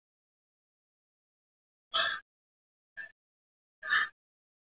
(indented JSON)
{
  "exhalation_length": "4.6 s",
  "exhalation_amplitude": 5334,
  "exhalation_signal_mean_std_ratio": 0.26,
  "survey_phase": "beta (2021-08-13 to 2022-03-07)",
  "age": "18-44",
  "gender": "Male",
  "wearing_mask": "No",
  "symptom_cough_any": true,
  "symptom_runny_or_blocked_nose": true,
  "smoker_status": "Never smoked",
  "respiratory_condition_asthma": false,
  "respiratory_condition_other": false,
  "recruitment_source": "Test and Trace",
  "submission_delay": "1 day",
  "covid_test_result": "Positive",
  "covid_test_method": "LFT"
}